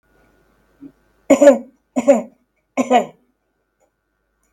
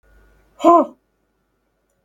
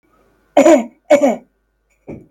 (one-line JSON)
{"three_cough_length": "4.5 s", "three_cough_amplitude": 32768, "three_cough_signal_mean_std_ratio": 0.29, "exhalation_length": "2.0 s", "exhalation_amplitude": 32766, "exhalation_signal_mean_std_ratio": 0.25, "cough_length": "2.3 s", "cough_amplitude": 32768, "cough_signal_mean_std_ratio": 0.39, "survey_phase": "beta (2021-08-13 to 2022-03-07)", "age": "65+", "gender": "Female", "wearing_mask": "No", "symptom_none": true, "smoker_status": "Never smoked", "respiratory_condition_asthma": false, "respiratory_condition_other": false, "recruitment_source": "REACT", "submission_delay": "2 days", "covid_test_result": "Negative", "covid_test_method": "RT-qPCR", "influenza_a_test_result": "Unknown/Void", "influenza_b_test_result": "Unknown/Void"}